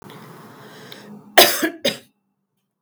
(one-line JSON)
{"cough_length": "2.8 s", "cough_amplitude": 32768, "cough_signal_mean_std_ratio": 0.3, "survey_phase": "beta (2021-08-13 to 2022-03-07)", "age": "45-64", "gender": "Female", "wearing_mask": "No", "symptom_headache": true, "smoker_status": "Ex-smoker", "respiratory_condition_asthma": false, "respiratory_condition_other": false, "recruitment_source": "REACT", "submission_delay": "4 days", "covid_test_result": "Negative", "covid_test_method": "RT-qPCR", "influenza_a_test_result": "Unknown/Void", "influenza_b_test_result": "Unknown/Void"}